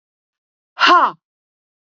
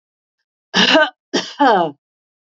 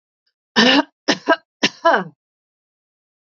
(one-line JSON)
{"exhalation_length": "1.9 s", "exhalation_amplitude": 31098, "exhalation_signal_mean_std_ratio": 0.33, "three_cough_length": "2.6 s", "three_cough_amplitude": 31010, "three_cough_signal_mean_std_ratio": 0.44, "cough_length": "3.3 s", "cough_amplitude": 30887, "cough_signal_mean_std_ratio": 0.35, "survey_phase": "beta (2021-08-13 to 2022-03-07)", "age": "45-64", "gender": "Female", "wearing_mask": "No", "symptom_none": true, "smoker_status": "Never smoked", "respiratory_condition_asthma": false, "respiratory_condition_other": false, "recruitment_source": "REACT", "submission_delay": "2 days", "covid_test_result": "Negative", "covid_test_method": "RT-qPCR", "influenza_a_test_result": "Negative", "influenza_b_test_result": "Negative"}